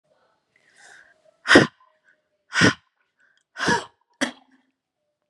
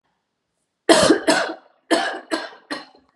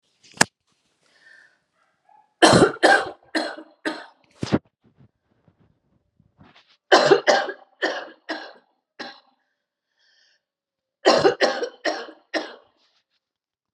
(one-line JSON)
{"exhalation_length": "5.3 s", "exhalation_amplitude": 32767, "exhalation_signal_mean_std_ratio": 0.25, "cough_length": "3.2 s", "cough_amplitude": 32686, "cough_signal_mean_std_ratio": 0.42, "three_cough_length": "13.7 s", "three_cough_amplitude": 32768, "three_cough_signal_mean_std_ratio": 0.31, "survey_phase": "beta (2021-08-13 to 2022-03-07)", "age": "45-64", "gender": "Female", "wearing_mask": "No", "symptom_new_continuous_cough": true, "symptom_sore_throat": true, "symptom_other": true, "symptom_onset": "12 days", "smoker_status": "Never smoked", "respiratory_condition_asthma": false, "respiratory_condition_other": false, "recruitment_source": "REACT", "submission_delay": "0 days", "covid_test_result": "Negative", "covid_test_method": "RT-qPCR"}